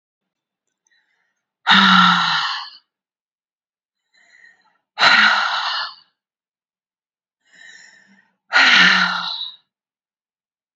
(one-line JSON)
{"exhalation_length": "10.8 s", "exhalation_amplitude": 30861, "exhalation_signal_mean_std_ratio": 0.39, "survey_phase": "beta (2021-08-13 to 2022-03-07)", "age": "45-64", "gender": "Female", "wearing_mask": "No", "symptom_none": true, "smoker_status": "Ex-smoker", "respiratory_condition_asthma": false, "respiratory_condition_other": false, "recruitment_source": "REACT", "submission_delay": "2 days", "covid_test_result": "Negative", "covid_test_method": "RT-qPCR", "influenza_a_test_result": "Negative", "influenza_b_test_result": "Negative"}